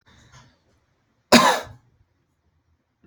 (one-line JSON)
{"cough_length": "3.1 s", "cough_amplitude": 29153, "cough_signal_mean_std_ratio": 0.23, "survey_phase": "alpha (2021-03-01 to 2021-08-12)", "age": "18-44", "gender": "Male", "wearing_mask": "No", "symptom_none": true, "smoker_status": "Never smoked", "respiratory_condition_asthma": false, "respiratory_condition_other": false, "recruitment_source": "REACT", "submission_delay": "1 day", "covid_test_result": "Negative", "covid_test_method": "RT-qPCR"}